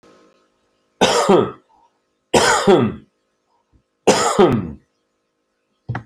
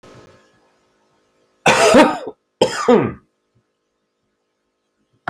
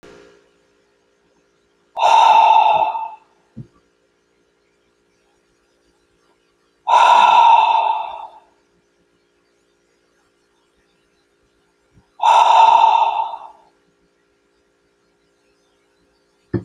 {
  "three_cough_length": "6.1 s",
  "three_cough_amplitude": 32403,
  "three_cough_signal_mean_std_ratio": 0.42,
  "cough_length": "5.3 s",
  "cough_amplitude": 30775,
  "cough_signal_mean_std_ratio": 0.33,
  "exhalation_length": "16.6 s",
  "exhalation_amplitude": 28502,
  "exhalation_signal_mean_std_ratio": 0.38,
  "survey_phase": "alpha (2021-03-01 to 2021-08-12)",
  "age": "45-64",
  "gender": "Male",
  "wearing_mask": "No",
  "symptom_abdominal_pain": true,
  "smoker_status": "Current smoker (e-cigarettes or vapes only)",
  "respiratory_condition_asthma": false,
  "respiratory_condition_other": false,
  "recruitment_source": "REACT",
  "submission_delay": "1 day",
  "covid_test_result": "Negative",
  "covid_test_method": "RT-qPCR"
}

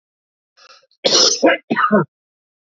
{
  "cough_length": "2.7 s",
  "cough_amplitude": 31076,
  "cough_signal_mean_std_ratio": 0.44,
  "survey_phase": "beta (2021-08-13 to 2022-03-07)",
  "age": "18-44",
  "gender": "Male",
  "wearing_mask": "No",
  "symptom_cough_any": true,
  "symptom_shortness_of_breath": true,
  "symptom_sore_throat": true,
  "symptom_fatigue": true,
  "symptom_headache": true,
  "symptom_change_to_sense_of_smell_or_taste": true,
  "symptom_onset": "4 days",
  "smoker_status": "Current smoker (1 to 10 cigarettes per day)",
  "respiratory_condition_asthma": false,
  "respiratory_condition_other": false,
  "recruitment_source": "Test and Trace",
  "submission_delay": "2 days",
  "covid_test_result": "Positive",
  "covid_test_method": "RT-qPCR",
  "covid_ct_value": 22.4,
  "covid_ct_gene": "N gene"
}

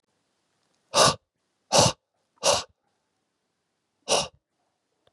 {
  "exhalation_length": "5.1 s",
  "exhalation_amplitude": 22844,
  "exhalation_signal_mean_std_ratio": 0.29,
  "survey_phase": "beta (2021-08-13 to 2022-03-07)",
  "age": "18-44",
  "gender": "Male",
  "wearing_mask": "No",
  "symptom_cough_any": true,
  "symptom_sore_throat": true,
  "symptom_headache": true,
  "symptom_onset": "2 days",
  "smoker_status": "Ex-smoker",
  "respiratory_condition_asthma": false,
  "respiratory_condition_other": false,
  "recruitment_source": "Test and Trace",
  "submission_delay": "0 days",
  "covid_test_result": "Positive",
  "covid_test_method": "RT-qPCR",
  "covid_ct_value": 21.9,
  "covid_ct_gene": "N gene"
}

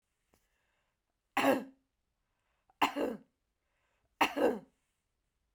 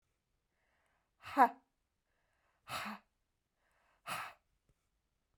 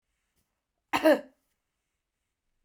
{
  "three_cough_length": "5.5 s",
  "three_cough_amplitude": 6000,
  "three_cough_signal_mean_std_ratio": 0.3,
  "exhalation_length": "5.4 s",
  "exhalation_amplitude": 7586,
  "exhalation_signal_mean_std_ratio": 0.19,
  "cough_length": "2.6 s",
  "cough_amplitude": 9802,
  "cough_signal_mean_std_ratio": 0.22,
  "survey_phase": "beta (2021-08-13 to 2022-03-07)",
  "age": "45-64",
  "gender": "Female",
  "wearing_mask": "No",
  "symptom_none": true,
  "smoker_status": "Never smoked",
  "respiratory_condition_asthma": false,
  "respiratory_condition_other": false,
  "recruitment_source": "REACT",
  "submission_delay": "4 days",
  "covid_test_result": "Negative",
  "covid_test_method": "RT-qPCR"
}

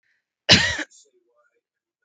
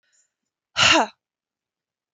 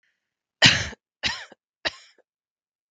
{
  "cough_length": "2.0 s",
  "cough_amplitude": 32766,
  "cough_signal_mean_std_ratio": 0.27,
  "exhalation_length": "2.1 s",
  "exhalation_amplitude": 21889,
  "exhalation_signal_mean_std_ratio": 0.29,
  "three_cough_length": "2.9 s",
  "three_cough_amplitude": 32766,
  "three_cough_signal_mean_std_ratio": 0.26,
  "survey_phase": "beta (2021-08-13 to 2022-03-07)",
  "age": "45-64",
  "gender": "Female",
  "wearing_mask": "No",
  "symptom_sore_throat": true,
  "symptom_onset": "6 days",
  "smoker_status": "Never smoked",
  "respiratory_condition_asthma": false,
  "respiratory_condition_other": false,
  "recruitment_source": "REACT",
  "submission_delay": "1 day",
  "covid_test_result": "Negative",
  "covid_test_method": "RT-qPCR",
  "influenza_a_test_result": "Unknown/Void",
  "influenza_b_test_result": "Unknown/Void"
}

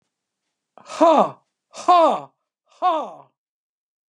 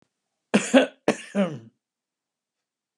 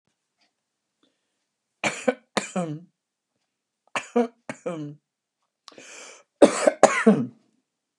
{
  "exhalation_length": "4.1 s",
  "exhalation_amplitude": 26549,
  "exhalation_signal_mean_std_ratio": 0.37,
  "cough_length": "3.0 s",
  "cough_amplitude": 22674,
  "cough_signal_mean_std_ratio": 0.3,
  "three_cough_length": "8.0 s",
  "three_cough_amplitude": 32531,
  "three_cough_signal_mean_std_ratio": 0.27,
  "survey_phase": "beta (2021-08-13 to 2022-03-07)",
  "age": "65+",
  "gender": "Female",
  "wearing_mask": "Yes",
  "symptom_none": true,
  "smoker_status": "Ex-smoker",
  "respiratory_condition_asthma": false,
  "respiratory_condition_other": false,
  "recruitment_source": "REACT",
  "submission_delay": "3 days",
  "covid_test_result": "Negative",
  "covid_test_method": "RT-qPCR",
  "influenza_a_test_result": "Negative",
  "influenza_b_test_result": "Negative"
}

